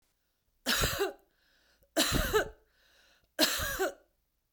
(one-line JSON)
{"three_cough_length": "4.5 s", "three_cough_amplitude": 9235, "three_cough_signal_mean_std_ratio": 0.46, "survey_phase": "beta (2021-08-13 to 2022-03-07)", "age": "45-64", "gender": "Female", "wearing_mask": "No", "symptom_none": true, "smoker_status": "Ex-smoker", "respiratory_condition_asthma": false, "respiratory_condition_other": false, "recruitment_source": "REACT", "submission_delay": "2 days", "covid_test_result": "Negative", "covid_test_method": "RT-qPCR", "influenza_a_test_result": "Negative", "influenza_b_test_result": "Negative"}